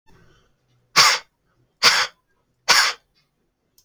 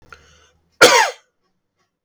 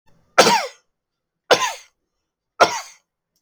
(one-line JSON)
{"exhalation_length": "3.8 s", "exhalation_amplitude": 32767, "exhalation_signal_mean_std_ratio": 0.33, "cough_length": "2.0 s", "cough_amplitude": 32768, "cough_signal_mean_std_ratio": 0.29, "three_cough_length": "3.4 s", "three_cough_amplitude": 32768, "three_cough_signal_mean_std_ratio": 0.31, "survey_phase": "alpha (2021-03-01 to 2021-08-12)", "age": "45-64", "gender": "Male", "wearing_mask": "No", "symptom_none": true, "symptom_onset": "6 days", "smoker_status": "Ex-smoker", "respiratory_condition_asthma": false, "respiratory_condition_other": false, "recruitment_source": "REACT", "submission_delay": "1 day", "covid_test_result": "Negative", "covid_test_method": "RT-qPCR"}